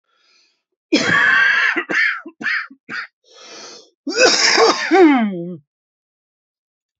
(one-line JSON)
{"cough_length": "7.0 s", "cough_amplitude": 32767, "cough_signal_mean_std_ratio": 0.54, "survey_phase": "beta (2021-08-13 to 2022-03-07)", "age": "18-44", "gender": "Male", "wearing_mask": "No", "symptom_cough_any": true, "symptom_new_continuous_cough": true, "symptom_runny_or_blocked_nose": true, "symptom_fatigue": true, "symptom_fever_high_temperature": true, "symptom_headache": true, "symptom_loss_of_taste": true, "symptom_other": true, "symptom_onset": "5 days", "smoker_status": "Ex-smoker", "respiratory_condition_asthma": true, "respiratory_condition_other": false, "recruitment_source": "Test and Trace", "submission_delay": "2 days", "covid_test_result": "Positive", "covid_test_method": "RT-qPCR", "covid_ct_value": 17.8, "covid_ct_gene": "N gene"}